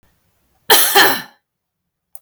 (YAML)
cough_length: 2.2 s
cough_amplitude: 32768
cough_signal_mean_std_ratio: 0.39
survey_phase: beta (2021-08-13 to 2022-03-07)
age: 18-44
gender: Female
wearing_mask: 'No'
symptom_none: true
smoker_status: Never smoked
respiratory_condition_asthma: false
respiratory_condition_other: false
recruitment_source: REACT
submission_delay: 1 day
covid_test_result: Negative
covid_test_method: RT-qPCR
influenza_a_test_result: Negative
influenza_b_test_result: Negative